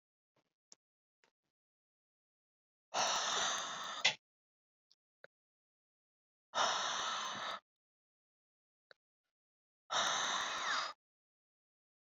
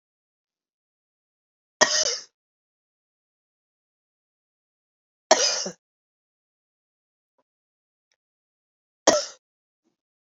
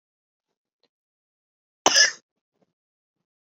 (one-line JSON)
{"exhalation_length": "12.1 s", "exhalation_amplitude": 4855, "exhalation_signal_mean_std_ratio": 0.41, "three_cough_length": "10.3 s", "three_cough_amplitude": 30547, "three_cough_signal_mean_std_ratio": 0.2, "cough_length": "3.4 s", "cough_amplitude": 27245, "cough_signal_mean_std_ratio": 0.19, "survey_phase": "beta (2021-08-13 to 2022-03-07)", "age": "18-44", "gender": "Female", "wearing_mask": "No", "symptom_cough_any": true, "symptom_runny_or_blocked_nose": true, "symptom_sore_throat": true, "symptom_fatigue": true, "symptom_fever_high_temperature": true, "symptom_headache": true, "symptom_onset": "6 days", "smoker_status": "Never smoked", "respiratory_condition_asthma": false, "respiratory_condition_other": false, "recruitment_source": "Test and Trace", "submission_delay": "2 days", "covid_test_result": "Positive", "covid_test_method": "RT-qPCR", "covid_ct_value": 17.5, "covid_ct_gene": "ORF1ab gene", "covid_ct_mean": 18.1, "covid_viral_load": "1100000 copies/ml", "covid_viral_load_category": "High viral load (>1M copies/ml)"}